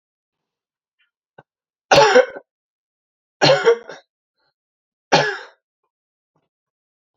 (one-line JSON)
{"three_cough_length": "7.2 s", "three_cough_amplitude": 32528, "three_cough_signal_mean_std_ratio": 0.28, "survey_phase": "alpha (2021-03-01 to 2021-08-12)", "age": "18-44", "gender": "Male", "wearing_mask": "No", "symptom_shortness_of_breath": true, "symptom_fatigue": true, "symptom_headache": true, "symptom_change_to_sense_of_smell_or_taste": true, "symptom_loss_of_taste": true, "symptom_onset": "3 days", "smoker_status": "Ex-smoker", "respiratory_condition_asthma": true, "respiratory_condition_other": false, "recruitment_source": "Test and Trace", "submission_delay": "2 days", "covid_test_result": "Positive", "covid_test_method": "RT-qPCR", "covid_ct_value": 28.7, "covid_ct_gene": "N gene"}